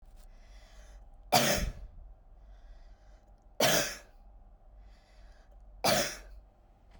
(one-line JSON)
{"three_cough_length": "7.0 s", "three_cough_amplitude": 9418, "three_cough_signal_mean_std_ratio": 0.39, "survey_phase": "beta (2021-08-13 to 2022-03-07)", "age": "18-44", "gender": "Female", "wearing_mask": "Yes", "symptom_none": true, "smoker_status": "Never smoked", "respiratory_condition_asthma": true, "respiratory_condition_other": false, "recruitment_source": "REACT", "submission_delay": "1 day", "covid_test_result": "Negative", "covid_test_method": "RT-qPCR", "influenza_a_test_result": "Negative", "influenza_b_test_result": "Negative"}